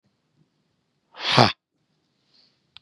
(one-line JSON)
{"exhalation_length": "2.8 s", "exhalation_amplitude": 32767, "exhalation_signal_mean_std_ratio": 0.22, "survey_phase": "beta (2021-08-13 to 2022-03-07)", "age": "18-44", "gender": "Male", "wearing_mask": "No", "symptom_none": true, "smoker_status": "Never smoked", "respiratory_condition_asthma": true, "respiratory_condition_other": false, "recruitment_source": "REACT", "submission_delay": "1 day", "covid_test_result": "Negative", "covid_test_method": "RT-qPCR", "influenza_a_test_result": "Negative", "influenza_b_test_result": "Negative"}